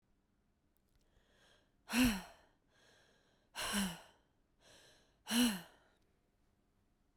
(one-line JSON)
{"exhalation_length": "7.2 s", "exhalation_amplitude": 3304, "exhalation_signal_mean_std_ratio": 0.3, "survey_phase": "beta (2021-08-13 to 2022-03-07)", "age": "18-44", "gender": "Female", "wearing_mask": "No", "symptom_cough_any": true, "symptom_new_continuous_cough": true, "symptom_runny_or_blocked_nose": true, "symptom_shortness_of_breath": true, "symptom_sore_throat": true, "symptom_fatigue": true, "symptom_headache": true, "symptom_change_to_sense_of_smell_or_taste": true, "symptom_onset": "3 days", "smoker_status": "Never smoked", "respiratory_condition_asthma": false, "respiratory_condition_other": false, "recruitment_source": "Test and Trace", "submission_delay": "2 days", "covid_test_result": "Positive", "covid_test_method": "RT-qPCR"}